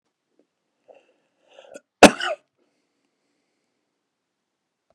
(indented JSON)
{
  "cough_length": "4.9 s",
  "cough_amplitude": 32768,
  "cough_signal_mean_std_ratio": 0.12,
  "survey_phase": "beta (2021-08-13 to 2022-03-07)",
  "age": "45-64",
  "gender": "Male",
  "wearing_mask": "No",
  "symptom_fatigue": true,
  "symptom_onset": "12 days",
  "smoker_status": "Ex-smoker",
  "respiratory_condition_asthma": true,
  "respiratory_condition_other": false,
  "recruitment_source": "REACT",
  "submission_delay": "3 days",
  "covid_test_result": "Negative",
  "covid_test_method": "RT-qPCR"
}